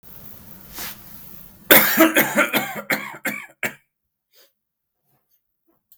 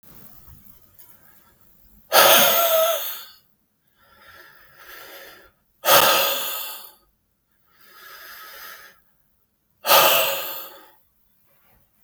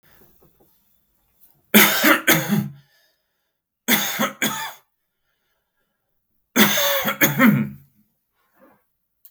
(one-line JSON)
{"cough_length": "6.0 s", "cough_amplitude": 32768, "cough_signal_mean_std_ratio": 0.36, "exhalation_length": "12.0 s", "exhalation_amplitude": 32766, "exhalation_signal_mean_std_ratio": 0.37, "three_cough_length": "9.3 s", "three_cough_amplitude": 32768, "three_cough_signal_mean_std_ratio": 0.39, "survey_phase": "beta (2021-08-13 to 2022-03-07)", "age": "18-44", "gender": "Male", "wearing_mask": "No", "symptom_none": true, "smoker_status": "Ex-smoker", "respiratory_condition_asthma": false, "respiratory_condition_other": false, "recruitment_source": "REACT", "submission_delay": "2 days", "covid_test_result": "Negative", "covid_test_method": "RT-qPCR", "influenza_a_test_result": "Negative", "influenza_b_test_result": "Negative"}